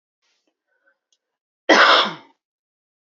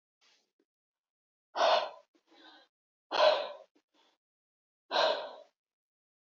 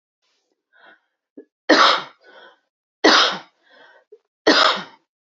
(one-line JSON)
{"cough_length": "3.2 s", "cough_amplitude": 28312, "cough_signal_mean_std_ratio": 0.29, "exhalation_length": "6.2 s", "exhalation_amplitude": 7005, "exhalation_signal_mean_std_ratio": 0.32, "three_cough_length": "5.4 s", "three_cough_amplitude": 30808, "three_cough_signal_mean_std_ratio": 0.34, "survey_phase": "beta (2021-08-13 to 2022-03-07)", "age": "18-44", "gender": "Female", "wearing_mask": "No", "symptom_none": true, "smoker_status": "Never smoked", "respiratory_condition_asthma": false, "respiratory_condition_other": false, "recruitment_source": "REACT", "submission_delay": "2 days", "covid_test_result": "Negative", "covid_test_method": "RT-qPCR", "influenza_a_test_result": "Negative", "influenza_b_test_result": "Negative"}